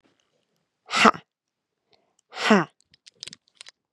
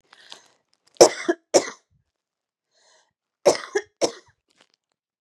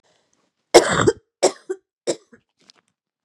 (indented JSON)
{
  "exhalation_length": "3.9 s",
  "exhalation_amplitude": 32767,
  "exhalation_signal_mean_std_ratio": 0.24,
  "cough_length": "5.2 s",
  "cough_amplitude": 32767,
  "cough_signal_mean_std_ratio": 0.22,
  "three_cough_length": "3.2 s",
  "three_cough_amplitude": 32768,
  "three_cough_signal_mean_std_ratio": 0.28,
  "survey_phase": "beta (2021-08-13 to 2022-03-07)",
  "age": "18-44",
  "gender": "Female",
  "wearing_mask": "No",
  "symptom_runny_or_blocked_nose": true,
  "symptom_fatigue": true,
  "symptom_fever_high_temperature": true,
  "symptom_headache": true,
  "symptom_onset": "4 days",
  "smoker_status": "Never smoked",
  "respiratory_condition_asthma": false,
  "respiratory_condition_other": false,
  "recruitment_source": "Test and Trace",
  "submission_delay": "2 days",
  "covid_test_result": "Positive",
  "covid_test_method": "RT-qPCR",
  "covid_ct_value": 18.8,
  "covid_ct_gene": "N gene",
  "covid_ct_mean": 19.9,
  "covid_viral_load": "300000 copies/ml",
  "covid_viral_load_category": "Low viral load (10K-1M copies/ml)"
}